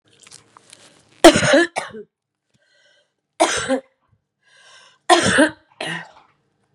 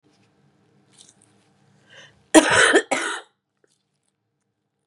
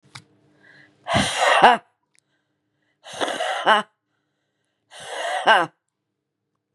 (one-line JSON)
{"three_cough_length": "6.7 s", "three_cough_amplitude": 32768, "three_cough_signal_mean_std_ratio": 0.32, "cough_length": "4.9 s", "cough_amplitude": 32767, "cough_signal_mean_std_ratio": 0.27, "exhalation_length": "6.7 s", "exhalation_amplitude": 32767, "exhalation_signal_mean_std_ratio": 0.36, "survey_phase": "beta (2021-08-13 to 2022-03-07)", "age": "45-64", "gender": "Female", "wearing_mask": "No", "symptom_cough_any": true, "symptom_runny_or_blocked_nose": true, "symptom_fatigue": true, "symptom_headache": true, "smoker_status": "Current smoker (1 to 10 cigarettes per day)", "respiratory_condition_asthma": false, "respiratory_condition_other": false, "recruitment_source": "Test and Trace", "submission_delay": "1 day", "covid_test_result": "Positive", "covid_test_method": "RT-qPCR", "covid_ct_value": 19.3, "covid_ct_gene": "ORF1ab gene", "covid_ct_mean": 19.8, "covid_viral_load": "330000 copies/ml", "covid_viral_load_category": "Low viral load (10K-1M copies/ml)"}